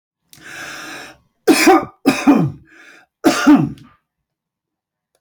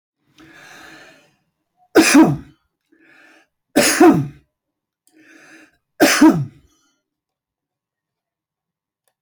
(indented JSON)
{
  "cough_length": "5.2 s",
  "cough_amplitude": 29195,
  "cough_signal_mean_std_ratio": 0.4,
  "three_cough_length": "9.2 s",
  "three_cough_amplitude": 29734,
  "three_cough_signal_mean_std_ratio": 0.31,
  "survey_phase": "beta (2021-08-13 to 2022-03-07)",
  "age": "65+",
  "gender": "Male",
  "wearing_mask": "No",
  "symptom_none": true,
  "smoker_status": "Ex-smoker",
  "respiratory_condition_asthma": false,
  "respiratory_condition_other": false,
  "recruitment_source": "REACT",
  "submission_delay": "1 day",
  "covid_test_result": "Negative",
  "covid_test_method": "RT-qPCR"
}